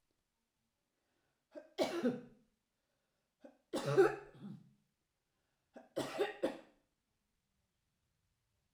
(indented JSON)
{
  "three_cough_length": "8.7 s",
  "three_cough_amplitude": 4078,
  "three_cough_signal_mean_std_ratio": 0.28,
  "survey_phase": "alpha (2021-03-01 to 2021-08-12)",
  "age": "65+",
  "gender": "Female",
  "wearing_mask": "No",
  "symptom_none": true,
  "smoker_status": "Never smoked",
  "respiratory_condition_asthma": false,
  "respiratory_condition_other": false,
  "recruitment_source": "REACT",
  "submission_delay": "1 day",
  "covid_test_result": "Negative",
  "covid_test_method": "RT-qPCR"
}